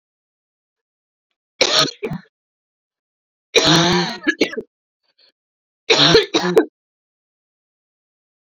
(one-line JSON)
{"three_cough_length": "8.4 s", "three_cough_amplitude": 29701, "three_cough_signal_mean_std_ratio": 0.36, "survey_phase": "beta (2021-08-13 to 2022-03-07)", "age": "18-44", "gender": "Female", "wearing_mask": "No", "symptom_cough_any": true, "symptom_runny_or_blocked_nose": true, "symptom_shortness_of_breath": true, "symptom_abdominal_pain": true, "symptom_diarrhoea": true, "symptom_fatigue": true, "symptom_fever_high_temperature": true, "symptom_other": true, "smoker_status": "Current smoker (1 to 10 cigarettes per day)", "respiratory_condition_asthma": true, "respiratory_condition_other": false, "recruitment_source": "Test and Trace", "submission_delay": "2 days", "covid_test_result": "Positive", "covid_test_method": "RT-qPCR", "covid_ct_value": 25.0, "covid_ct_gene": "N gene"}